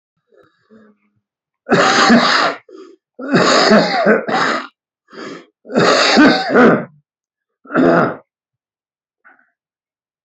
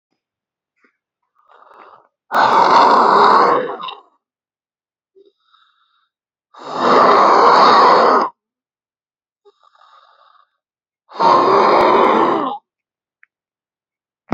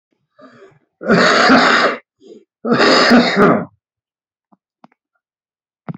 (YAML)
three_cough_length: 10.2 s
three_cough_amplitude: 32723
three_cough_signal_mean_std_ratio: 0.52
exhalation_length: 14.3 s
exhalation_amplitude: 30468
exhalation_signal_mean_std_ratio: 0.48
cough_length: 6.0 s
cough_amplitude: 30158
cough_signal_mean_std_ratio: 0.49
survey_phase: beta (2021-08-13 to 2022-03-07)
age: 45-64
gender: Male
wearing_mask: 'No'
symptom_cough_any: true
symptom_shortness_of_breath: true
smoker_status: Current smoker (1 to 10 cigarettes per day)
respiratory_condition_asthma: false
respiratory_condition_other: true
recruitment_source: REACT
submission_delay: 2 days
covid_test_result: Negative
covid_test_method: RT-qPCR
influenza_a_test_result: Negative
influenza_b_test_result: Negative